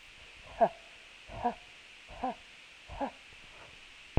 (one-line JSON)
{"exhalation_length": "4.2 s", "exhalation_amplitude": 11955, "exhalation_signal_mean_std_ratio": 0.35, "survey_phase": "alpha (2021-03-01 to 2021-08-12)", "age": "45-64", "gender": "Female", "wearing_mask": "No", "symptom_none": true, "smoker_status": "Never smoked", "respiratory_condition_asthma": false, "respiratory_condition_other": false, "recruitment_source": "REACT", "submission_delay": "2 days", "covid_test_result": "Negative", "covid_test_method": "RT-qPCR"}